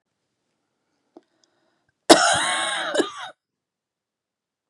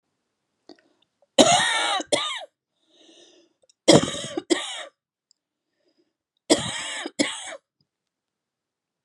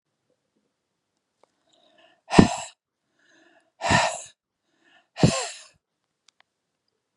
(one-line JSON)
{"cough_length": "4.7 s", "cough_amplitude": 32768, "cough_signal_mean_std_ratio": 0.3, "three_cough_length": "9.0 s", "three_cough_amplitude": 32767, "three_cough_signal_mean_std_ratio": 0.32, "exhalation_length": "7.2 s", "exhalation_amplitude": 32768, "exhalation_signal_mean_std_ratio": 0.23, "survey_phase": "beta (2021-08-13 to 2022-03-07)", "age": "45-64", "gender": "Female", "wearing_mask": "No", "symptom_cough_any": true, "symptom_runny_or_blocked_nose": true, "symptom_sore_throat": true, "symptom_headache": true, "symptom_onset": "12 days", "smoker_status": "Never smoked", "respiratory_condition_asthma": false, "respiratory_condition_other": false, "recruitment_source": "REACT", "submission_delay": "1 day", "covid_test_result": "Negative", "covid_test_method": "RT-qPCR"}